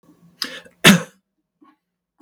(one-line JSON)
{"cough_length": "2.2 s", "cough_amplitude": 32768, "cough_signal_mean_std_ratio": 0.23, "survey_phase": "beta (2021-08-13 to 2022-03-07)", "age": "65+", "gender": "Male", "wearing_mask": "No", "symptom_cough_any": true, "symptom_runny_or_blocked_nose": true, "symptom_onset": "12 days", "smoker_status": "Ex-smoker", "respiratory_condition_asthma": false, "respiratory_condition_other": false, "recruitment_source": "REACT", "submission_delay": "1 day", "covid_test_result": "Negative", "covid_test_method": "RT-qPCR"}